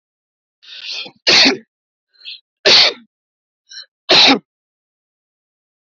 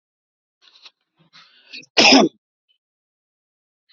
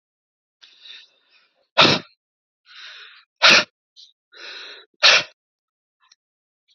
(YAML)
three_cough_length: 5.9 s
three_cough_amplitude: 29881
three_cough_signal_mean_std_ratio: 0.34
cough_length: 3.9 s
cough_amplitude: 32768
cough_signal_mean_std_ratio: 0.24
exhalation_length: 6.7 s
exhalation_amplitude: 32767
exhalation_signal_mean_std_ratio: 0.25
survey_phase: beta (2021-08-13 to 2022-03-07)
age: 18-44
gender: Male
wearing_mask: 'No'
symptom_cough_any: true
symptom_runny_or_blocked_nose: true
symptom_onset: 13 days
smoker_status: Never smoked
respiratory_condition_asthma: false
respiratory_condition_other: false
recruitment_source: REACT
submission_delay: 0 days
covid_test_result: Negative
covid_test_method: RT-qPCR
influenza_a_test_result: Negative
influenza_b_test_result: Negative